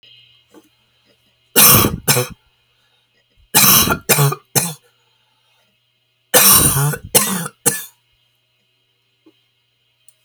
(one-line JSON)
{"three_cough_length": "10.2 s", "three_cough_amplitude": 32768, "three_cough_signal_mean_std_ratio": 0.38, "survey_phase": "alpha (2021-03-01 to 2021-08-12)", "age": "65+", "gender": "Female", "wearing_mask": "No", "symptom_none": true, "smoker_status": "Never smoked", "respiratory_condition_asthma": false, "respiratory_condition_other": true, "recruitment_source": "REACT", "submission_delay": "2 days", "covid_test_result": "Negative", "covid_test_method": "RT-qPCR"}